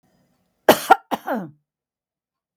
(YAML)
cough_length: 2.6 s
cough_amplitude: 32766
cough_signal_mean_std_ratio: 0.24
survey_phase: beta (2021-08-13 to 2022-03-07)
age: 65+
gender: Female
wearing_mask: 'No'
symptom_none: true
smoker_status: Ex-smoker
respiratory_condition_asthma: false
respiratory_condition_other: false
recruitment_source: REACT
submission_delay: 1 day
covid_test_result: Negative
covid_test_method: RT-qPCR
influenza_a_test_result: Negative
influenza_b_test_result: Negative